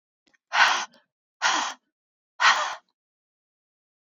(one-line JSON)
{"exhalation_length": "4.0 s", "exhalation_amplitude": 17369, "exhalation_signal_mean_std_ratio": 0.36, "survey_phase": "alpha (2021-03-01 to 2021-08-12)", "age": "18-44", "gender": "Female", "wearing_mask": "No", "symptom_none": true, "smoker_status": "Current smoker (1 to 10 cigarettes per day)", "respiratory_condition_asthma": true, "respiratory_condition_other": false, "recruitment_source": "Test and Trace", "submission_delay": "2 days", "covid_test_result": "Positive", "covid_test_method": "RT-qPCR", "covid_ct_value": 20.7, "covid_ct_gene": "N gene", "covid_ct_mean": 21.4, "covid_viral_load": "96000 copies/ml", "covid_viral_load_category": "Low viral load (10K-1M copies/ml)"}